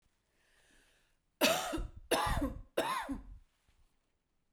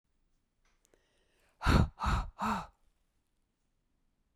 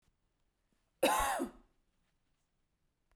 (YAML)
three_cough_length: 4.5 s
three_cough_amplitude: 6753
three_cough_signal_mean_std_ratio: 0.45
exhalation_length: 4.4 s
exhalation_amplitude: 6676
exhalation_signal_mean_std_ratio: 0.32
cough_length: 3.2 s
cough_amplitude: 4879
cough_signal_mean_std_ratio: 0.31
survey_phase: beta (2021-08-13 to 2022-03-07)
age: 45-64
gender: Female
wearing_mask: 'No'
symptom_none: true
symptom_onset: 12 days
smoker_status: Ex-smoker
respiratory_condition_asthma: false
respiratory_condition_other: false
recruitment_source: REACT
submission_delay: 1 day
covid_test_result: Negative
covid_test_method: RT-qPCR